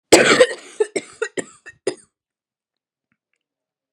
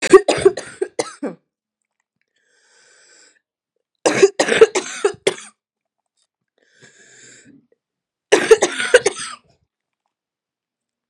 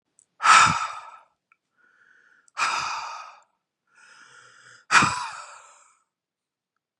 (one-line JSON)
{"cough_length": "3.9 s", "cough_amplitude": 32768, "cough_signal_mean_std_ratio": 0.29, "three_cough_length": "11.1 s", "three_cough_amplitude": 32768, "three_cough_signal_mean_std_ratio": 0.28, "exhalation_length": "7.0 s", "exhalation_amplitude": 27758, "exhalation_signal_mean_std_ratio": 0.31, "survey_phase": "beta (2021-08-13 to 2022-03-07)", "age": "18-44", "gender": "Female", "wearing_mask": "No", "symptom_cough_any": true, "symptom_new_continuous_cough": true, "symptom_runny_or_blocked_nose": true, "symptom_shortness_of_breath": true, "symptom_sore_throat": true, "symptom_fatigue": true, "symptom_headache": true, "symptom_other": true, "smoker_status": "Never smoked", "respiratory_condition_asthma": true, "respiratory_condition_other": false, "recruitment_source": "Test and Trace", "submission_delay": "1 day", "covid_test_result": "Positive", "covid_test_method": "RT-qPCR", "covid_ct_value": 34.6, "covid_ct_gene": "ORF1ab gene"}